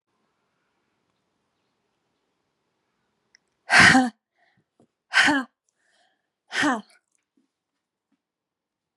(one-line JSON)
{"exhalation_length": "9.0 s", "exhalation_amplitude": 28204, "exhalation_signal_mean_std_ratio": 0.24, "survey_phase": "beta (2021-08-13 to 2022-03-07)", "age": "18-44", "gender": "Female", "wearing_mask": "No", "symptom_cough_any": true, "symptom_sore_throat": true, "symptom_other": true, "symptom_onset": "6 days", "smoker_status": "Never smoked", "respiratory_condition_asthma": false, "respiratory_condition_other": false, "recruitment_source": "Test and Trace", "submission_delay": "1 day", "covid_test_result": "Positive", "covid_test_method": "RT-qPCR", "covid_ct_value": 19.8, "covid_ct_gene": "ORF1ab gene", "covid_ct_mean": 20.1, "covid_viral_load": "260000 copies/ml", "covid_viral_load_category": "Low viral load (10K-1M copies/ml)"}